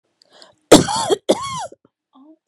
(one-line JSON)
{"cough_length": "2.5 s", "cough_amplitude": 32768, "cough_signal_mean_std_ratio": 0.33, "survey_phase": "beta (2021-08-13 to 2022-03-07)", "age": "45-64", "gender": "Female", "wearing_mask": "No", "symptom_none": true, "smoker_status": "Ex-smoker", "respiratory_condition_asthma": false, "respiratory_condition_other": false, "recruitment_source": "REACT", "submission_delay": "-5 days", "covid_test_result": "Negative", "covid_test_method": "RT-qPCR", "influenza_a_test_result": "Unknown/Void", "influenza_b_test_result": "Unknown/Void"}